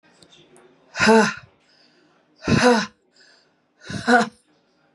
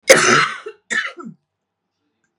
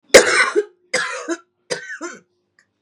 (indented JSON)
{
  "exhalation_length": "4.9 s",
  "exhalation_amplitude": 27149,
  "exhalation_signal_mean_std_ratio": 0.36,
  "cough_length": "2.4 s",
  "cough_amplitude": 32768,
  "cough_signal_mean_std_ratio": 0.38,
  "three_cough_length": "2.8 s",
  "three_cough_amplitude": 32768,
  "three_cough_signal_mean_std_ratio": 0.38,
  "survey_phase": "beta (2021-08-13 to 2022-03-07)",
  "age": "45-64",
  "gender": "Female",
  "wearing_mask": "No",
  "symptom_cough_any": true,
  "symptom_runny_or_blocked_nose": true,
  "symptom_shortness_of_breath": true,
  "symptom_fatigue": true,
  "symptom_fever_high_temperature": true,
  "symptom_headache": true,
  "symptom_change_to_sense_of_smell_or_taste": true,
  "symptom_onset": "5 days",
  "smoker_status": "Never smoked",
  "respiratory_condition_asthma": false,
  "respiratory_condition_other": false,
  "recruitment_source": "Test and Trace",
  "submission_delay": "2 days",
  "covid_test_result": "Positive",
  "covid_test_method": "RT-qPCR"
}